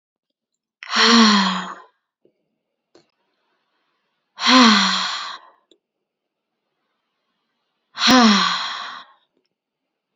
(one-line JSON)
{"exhalation_length": "10.2 s", "exhalation_amplitude": 29852, "exhalation_signal_mean_std_ratio": 0.37, "survey_phase": "beta (2021-08-13 to 2022-03-07)", "age": "18-44", "gender": "Female", "wearing_mask": "No", "symptom_fatigue": true, "symptom_onset": "12 days", "smoker_status": "Never smoked", "respiratory_condition_asthma": false, "respiratory_condition_other": false, "recruitment_source": "REACT", "submission_delay": "1 day", "covid_test_result": "Negative", "covid_test_method": "RT-qPCR", "influenza_a_test_result": "Negative", "influenza_b_test_result": "Negative"}